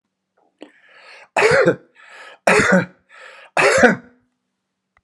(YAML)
three_cough_length: 5.0 s
three_cough_amplitude: 32767
three_cough_signal_mean_std_ratio: 0.41
survey_phase: beta (2021-08-13 to 2022-03-07)
age: 45-64
gender: Male
wearing_mask: 'No'
symptom_none: true
smoker_status: Never smoked
respiratory_condition_asthma: false
respiratory_condition_other: false
recruitment_source: REACT
submission_delay: 13 days
covid_test_result: Negative
covid_test_method: RT-qPCR